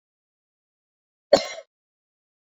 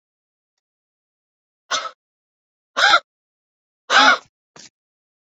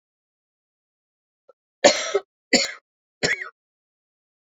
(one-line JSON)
{"cough_length": "2.5 s", "cough_amplitude": 31076, "cough_signal_mean_std_ratio": 0.15, "exhalation_length": "5.3 s", "exhalation_amplitude": 29511, "exhalation_signal_mean_std_ratio": 0.26, "three_cough_length": "4.5 s", "three_cough_amplitude": 32767, "three_cough_signal_mean_std_ratio": 0.26, "survey_phase": "beta (2021-08-13 to 2022-03-07)", "age": "18-44", "gender": "Female", "wearing_mask": "No", "symptom_cough_any": true, "symptom_runny_or_blocked_nose": true, "symptom_shortness_of_breath": true, "symptom_fatigue": true, "symptom_change_to_sense_of_smell_or_taste": true, "symptom_loss_of_taste": true, "symptom_other": true, "symptom_onset": "16 days", "smoker_status": "Ex-smoker", "respiratory_condition_asthma": false, "respiratory_condition_other": false, "recruitment_source": "Test and Trace", "submission_delay": "3 days", "covid_test_result": "Positive", "covid_test_method": "RT-qPCR"}